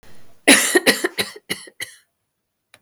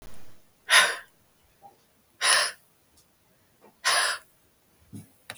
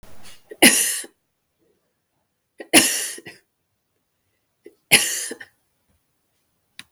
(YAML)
cough_length: 2.8 s
cough_amplitude: 32768
cough_signal_mean_std_ratio: 0.37
exhalation_length: 5.4 s
exhalation_amplitude: 26144
exhalation_signal_mean_std_ratio: 0.35
three_cough_length: 6.9 s
three_cough_amplitude: 32766
three_cough_signal_mean_std_ratio: 0.28
survey_phase: beta (2021-08-13 to 2022-03-07)
age: 45-64
gender: Female
wearing_mask: 'No'
symptom_none: true
symptom_onset: 12 days
smoker_status: Never smoked
respiratory_condition_asthma: false
respiratory_condition_other: false
recruitment_source: REACT
submission_delay: 2 days
covid_test_result: Negative
covid_test_method: RT-qPCR
influenza_a_test_result: Negative
influenza_b_test_result: Negative